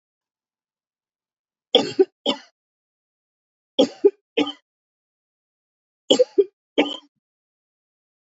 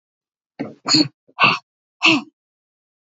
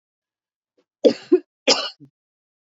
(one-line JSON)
{"three_cough_length": "8.3 s", "three_cough_amplitude": 28140, "three_cough_signal_mean_std_ratio": 0.23, "exhalation_length": "3.2 s", "exhalation_amplitude": 32767, "exhalation_signal_mean_std_ratio": 0.34, "cough_length": "2.6 s", "cough_amplitude": 28326, "cough_signal_mean_std_ratio": 0.26, "survey_phase": "beta (2021-08-13 to 2022-03-07)", "age": "45-64", "gender": "Female", "wearing_mask": "No", "symptom_cough_any": true, "symptom_fatigue": true, "symptom_onset": "13 days", "smoker_status": "Never smoked", "respiratory_condition_asthma": false, "respiratory_condition_other": false, "recruitment_source": "REACT", "submission_delay": "1 day", "covid_test_result": "Negative", "covid_test_method": "RT-qPCR"}